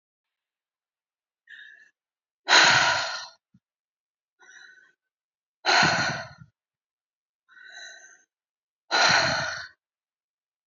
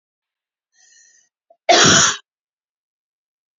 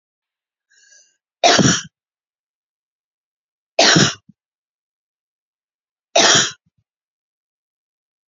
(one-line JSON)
{"exhalation_length": "10.7 s", "exhalation_amplitude": 20896, "exhalation_signal_mean_std_ratio": 0.33, "cough_length": "3.6 s", "cough_amplitude": 32768, "cough_signal_mean_std_ratio": 0.29, "three_cough_length": "8.3 s", "three_cough_amplitude": 32768, "three_cough_signal_mean_std_ratio": 0.28, "survey_phase": "beta (2021-08-13 to 2022-03-07)", "age": "45-64", "gender": "Female", "wearing_mask": "No", "symptom_none": true, "smoker_status": "Current smoker (e-cigarettes or vapes only)", "respiratory_condition_asthma": false, "respiratory_condition_other": false, "recruitment_source": "REACT", "submission_delay": "2 days", "covid_test_result": "Negative", "covid_test_method": "RT-qPCR", "influenza_a_test_result": "Negative", "influenza_b_test_result": "Negative"}